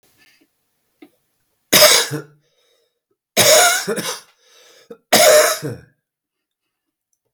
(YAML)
three_cough_length: 7.3 s
three_cough_amplitude: 32768
three_cough_signal_mean_std_ratio: 0.38
survey_phase: beta (2021-08-13 to 2022-03-07)
age: 65+
gender: Male
wearing_mask: 'No'
symptom_cough_any: true
smoker_status: Ex-smoker
respiratory_condition_asthma: false
respiratory_condition_other: false
recruitment_source: Test and Trace
submission_delay: 2 days
covid_test_result: Positive
covid_test_method: RT-qPCR
covid_ct_value: 23.9
covid_ct_gene: N gene